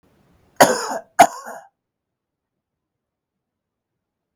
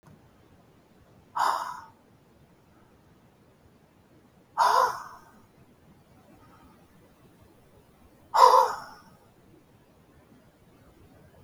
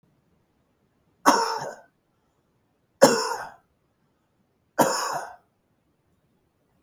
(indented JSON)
{
  "cough_length": "4.4 s",
  "cough_amplitude": 32768,
  "cough_signal_mean_std_ratio": 0.21,
  "exhalation_length": "11.4 s",
  "exhalation_amplitude": 20516,
  "exhalation_signal_mean_std_ratio": 0.26,
  "three_cough_length": "6.8 s",
  "three_cough_amplitude": 30370,
  "three_cough_signal_mean_std_ratio": 0.28,
  "survey_phase": "beta (2021-08-13 to 2022-03-07)",
  "age": "65+",
  "gender": "Male",
  "wearing_mask": "No",
  "symptom_none": true,
  "smoker_status": "Ex-smoker",
  "respiratory_condition_asthma": false,
  "respiratory_condition_other": true,
  "recruitment_source": "REACT",
  "submission_delay": "10 days",
  "covid_test_result": "Negative",
  "covid_test_method": "RT-qPCR",
  "influenza_a_test_result": "Negative",
  "influenza_b_test_result": "Negative"
}